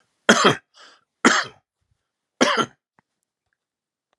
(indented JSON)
{
  "three_cough_length": "4.2 s",
  "three_cough_amplitude": 32767,
  "three_cough_signal_mean_std_ratio": 0.3,
  "survey_phase": "alpha (2021-03-01 to 2021-08-12)",
  "age": "45-64",
  "gender": "Male",
  "wearing_mask": "No",
  "symptom_none": true,
  "smoker_status": "Ex-smoker",
  "respiratory_condition_asthma": false,
  "respiratory_condition_other": false,
  "recruitment_source": "REACT",
  "submission_delay": "2 days",
  "covid_test_result": "Negative",
  "covid_test_method": "RT-qPCR"
}